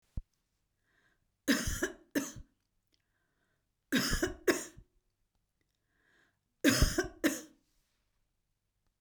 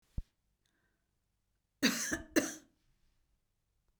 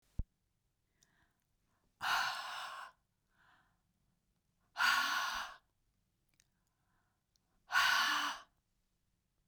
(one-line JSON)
{"three_cough_length": "9.0 s", "three_cough_amplitude": 9229, "three_cough_signal_mean_std_ratio": 0.32, "cough_length": "4.0 s", "cough_amplitude": 5690, "cough_signal_mean_std_ratio": 0.27, "exhalation_length": "9.5 s", "exhalation_amplitude": 4043, "exhalation_signal_mean_std_ratio": 0.37, "survey_phase": "beta (2021-08-13 to 2022-03-07)", "age": "65+", "gender": "Female", "wearing_mask": "No", "symptom_none": true, "smoker_status": "Never smoked", "respiratory_condition_asthma": false, "respiratory_condition_other": false, "recruitment_source": "REACT", "submission_delay": "1 day", "covid_test_result": "Negative", "covid_test_method": "RT-qPCR", "influenza_a_test_result": "Negative", "influenza_b_test_result": "Negative"}